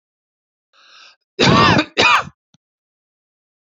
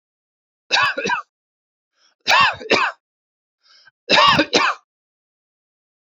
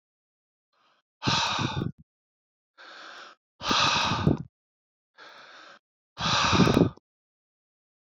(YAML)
cough_length: 3.8 s
cough_amplitude: 31208
cough_signal_mean_std_ratio: 0.36
three_cough_length: 6.1 s
three_cough_amplitude: 29200
three_cough_signal_mean_std_ratio: 0.4
exhalation_length: 8.0 s
exhalation_amplitude: 15395
exhalation_signal_mean_std_ratio: 0.41
survey_phase: beta (2021-08-13 to 2022-03-07)
age: 45-64
gender: Male
wearing_mask: 'No'
symptom_none: true
smoker_status: Never smoked
respiratory_condition_asthma: false
respiratory_condition_other: false
recruitment_source: REACT
submission_delay: 2 days
covid_test_result: Negative
covid_test_method: RT-qPCR
influenza_a_test_result: Negative
influenza_b_test_result: Negative